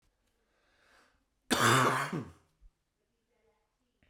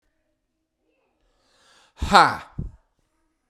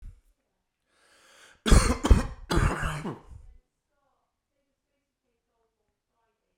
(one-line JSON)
{"cough_length": "4.1 s", "cough_amplitude": 7044, "cough_signal_mean_std_ratio": 0.32, "exhalation_length": "3.5 s", "exhalation_amplitude": 32768, "exhalation_signal_mean_std_ratio": 0.22, "three_cough_length": "6.6 s", "three_cough_amplitude": 19581, "three_cough_signal_mean_std_ratio": 0.27, "survey_phase": "beta (2021-08-13 to 2022-03-07)", "age": "18-44", "gender": "Female", "wearing_mask": "No", "symptom_cough_any": true, "symptom_abdominal_pain": true, "symptom_fatigue": true, "symptom_fever_high_temperature": true, "symptom_headache": true, "symptom_onset": "3 days", "smoker_status": "Ex-smoker", "respiratory_condition_asthma": true, "respiratory_condition_other": false, "recruitment_source": "Test and Trace", "submission_delay": "1 day", "covid_test_result": "Positive", "covid_test_method": "RT-qPCR", "covid_ct_value": 12.3, "covid_ct_gene": "ORF1ab gene", "covid_ct_mean": 13.2, "covid_viral_load": "48000000 copies/ml", "covid_viral_load_category": "High viral load (>1M copies/ml)"}